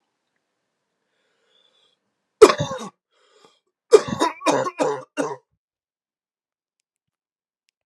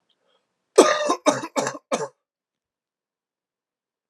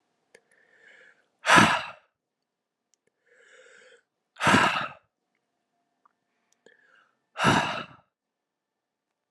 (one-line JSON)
{"three_cough_length": "7.9 s", "three_cough_amplitude": 32768, "three_cough_signal_mean_std_ratio": 0.22, "cough_length": "4.1 s", "cough_amplitude": 32489, "cough_signal_mean_std_ratio": 0.29, "exhalation_length": "9.3 s", "exhalation_amplitude": 27290, "exhalation_signal_mean_std_ratio": 0.27, "survey_phase": "alpha (2021-03-01 to 2021-08-12)", "age": "18-44", "gender": "Male", "wearing_mask": "No", "symptom_cough_any": true, "symptom_headache": true, "symptom_onset": "2 days", "smoker_status": "Never smoked", "respiratory_condition_asthma": false, "respiratory_condition_other": false, "recruitment_source": "Test and Trace", "submission_delay": "2 days", "covid_test_result": "Positive", "covid_test_method": "RT-qPCR", "covid_ct_value": 31.8, "covid_ct_gene": "ORF1ab gene"}